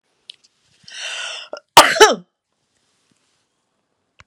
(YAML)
three_cough_length: 4.3 s
three_cough_amplitude: 32768
three_cough_signal_mean_std_ratio: 0.24
survey_phase: beta (2021-08-13 to 2022-03-07)
age: 65+
gender: Female
wearing_mask: 'No'
symptom_none: true
smoker_status: Ex-smoker
respiratory_condition_asthma: false
respiratory_condition_other: false
recruitment_source: REACT
submission_delay: 2 days
covid_test_result: Negative
covid_test_method: RT-qPCR